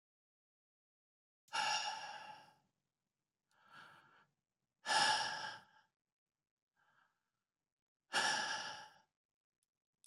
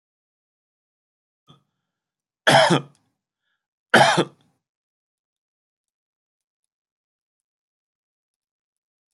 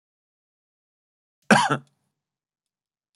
exhalation_length: 10.1 s
exhalation_amplitude: 3253
exhalation_signal_mean_std_ratio: 0.34
three_cough_length: 9.1 s
three_cough_amplitude: 25132
three_cough_signal_mean_std_ratio: 0.2
cough_length: 3.2 s
cough_amplitude: 24443
cough_signal_mean_std_ratio: 0.2
survey_phase: beta (2021-08-13 to 2022-03-07)
age: 65+
gender: Male
wearing_mask: 'No'
symptom_none: true
smoker_status: Ex-smoker
respiratory_condition_asthma: false
respiratory_condition_other: true
recruitment_source: REACT
submission_delay: 0 days
covid_test_result: Negative
covid_test_method: RT-qPCR
influenza_a_test_result: Negative
influenza_b_test_result: Negative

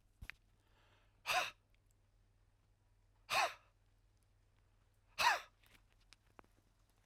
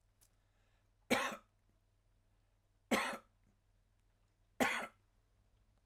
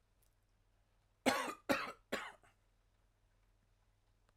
exhalation_length: 7.1 s
exhalation_amplitude: 3055
exhalation_signal_mean_std_ratio: 0.26
three_cough_length: 5.9 s
three_cough_amplitude: 4938
three_cough_signal_mean_std_ratio: 0.28
cough_length: 4.4 s
cough_amplitude: 4900
cough_signal_mean_std_ratio: 0.29
survey_phase: alpha (2021-03-01 to 2021-08-12)
age: 45-64
gender: Male
wearing_mask: 'No'
symptom_none: true
smoker_status: Never smoked
respiratory_condition_asthma: false
respiratory_condition_other: false
recruitment_source: REACT
submission_delay: 1 day
covid_test_result: Negative
covid_test_method: RT-qPCR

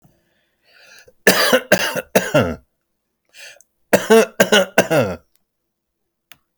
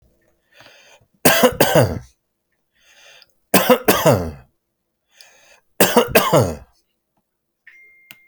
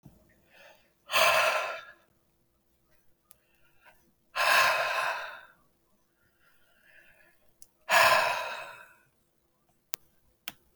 cough_length: 6.6 s
cough_amplitude: 32768
cough_signal_mean_std_ratio: 0.39
three_cough_length: 8.3 s
three_cough_amplitude: 32768
three_cough_signal_mean_std_ratio: 0.37
exhalation_length: 10.8 s
exhalation_amplitude: 20216
exhalation_signal_mean_std_ratio: 0.37
survey_phase: beta (2021-08-13 to 2022-03-07)
age: 45-64
gender: Male
wearing_mask: 'No'
symptom_none: true
smoker_status: Ex-smoker
respiratory_condition_asthma: false
respiratory_condition_other: false
recruitment_source: REACT
submission_delay: 2 days
covid_test_result: Negative
covid_test_method: RT-qPCR
influenza_a_test_result: Negative
influenza_b_test_result: Negative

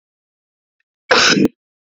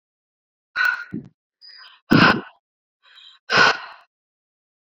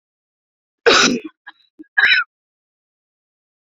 cough_length: 2.0 s
cough_amplitude: 32767
cough_signal_mean_std_ratio: 0.36
exhalation_length: 4.9 s
exhalation_amplitude: 27166
exhalation_signal_mean_std_ratio: 0.32
three_cough_length: 3.7 s
three_cough_amplitude: 28447
three_cough_signal_mean_std_ratio: 0.33
survey_phase: beta (2021-08-13 to 2022-03-07)
age: 18-44
gender: Female
wearing_mask: 'No'
symptom_cough_any: true
symptom_headache: true
symptom_onset: 5 days
smoker_status: Never smoked
respiratory_condition_asthma: false
respiratory_condition_other: false
recruitment_source: Test and Trace
submission_delay: 2 days
covid_test_result: Positive
covid_test_method: RT-qPCR
covid_ct_value: 17.7
covid_ct_gene: N gene
covid_ct_mean: 17.8
covid_viral_load: 1400000 copies/ml
covid_viral_load_category: High viral load (>1M copies/ml)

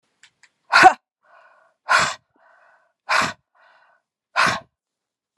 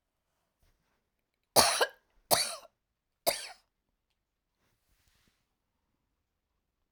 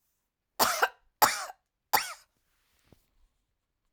exhalation_length: 5.4 s
exhalation_amplitude: 32767
exhalation_signal_mean_std_ratio: 0.29
three_cough_length: 6.9 s
three_cough_amplitude: 18040
three_cough_signal_mean_std_ratio: 0.22
cough_length: 3.9 s
cough_amplitude: 15955
cough_signal_mean_std_ratio: 0.28
survey_phase: alpha (2021-03-01 to 2021-08-12)
age: 45-64
gender: Female
wearing_mask: 'No'
symptom_none: true
symptom_onset: 6 days
smoker_status: Never smoked
respiratory_condition_asthma: false
respiratory_condition_other: false
recruitment_source: REACT
submission_delay: 2 days
covid_test_result: Negative
covid_test_method: RT-qPCR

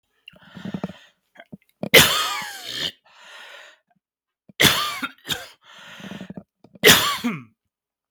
three_cough_length: 8.1 s
three_cough_amplitude: 32768
three_cough_signal_mean_std_ratio: 0.34
survey_phase: beta (2021-08-13 to 2022-03-07)
age: 45-64
gender: Male
wearing_mask: 'No'
symptom_none: true
smoker_status: Never smoked
respiratory_condition_asthma: false
respiratory_condition_other: false
recruitment_source: REACT
submission_delay: 1 day
covid_test_result: Negative
covid_test_method: RT-qPCR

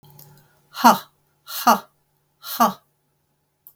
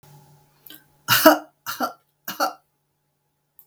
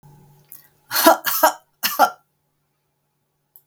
exhalation_length: 3.8 s
exhalation_amplitude: 32766
exhalation_signal_mean_std_ratio: 0.28
three_cough_length: 3.7 s
three_cough_amplitude: 32768
three_cough_signal_mean_std_ratio: 0.28
cough_length: 3.7 s
cough_amplitude: 32766
cough_signal_mean_std_ratio: 0.32
survey_phase: beta (2021-08-13 to 2022-03-07)
age: 65+
gender: Female
wearing_mask: 'No'
symptom_fatigue: true
smoker_status: Never smoked
respiratory_condition_asthma: false
respiratory_condition_other: false
recruitment_source: REACT
submission_delay: 3 days
covid_test_result: Negative
covid_test_method: RT-qPCR
influenza_a_test_result: Negative
influenza_b_test_result: Negative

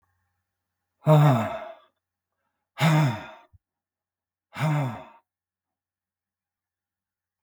exhalation_length: 7.4 s
exhalation_amplitude: 15158
exhalation_signal_mean_std_ratio: 0.33
survey_phase: beta (2021-08-13 to 2022-03-07)
age: 65+
gender: Male
wearing_mask: 'No'
symptom_cough_any: true
smoker_status: Ex-smoker
respiratory_condition_asthma: true
respiratory_condition_other: false
recruitment_source: REACT
submission_delay: 2 days
covid_test_result: Negative
covid_test_method: RT-qPCR
influenza_a_test_result: Negative
influenza_b_test_result: Negative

